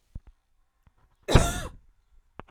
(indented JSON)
{
  "cough_length": "2.5 s",
  "cough_amplitude": 24238,
  "cough_signal_mean_std_ratio": 0.25,
  "survey_phase": "alpha (2021-03-01 to 2021-08-12)",
  "age": "18-44",
  "gender": "Female",
  "wearing_mask": "No",
  "symptom_none": true,
  "smoker_status": "Ex-smoker",
  "respiratory_condition_asthma": false,
  "respiratory_condition_other": false,
  "recruitment_source": "REACT",
  "submission_delay": "1 day",
  "covid_test_result": "Negative",
  "covid_test_method": "RT-qPCR"
}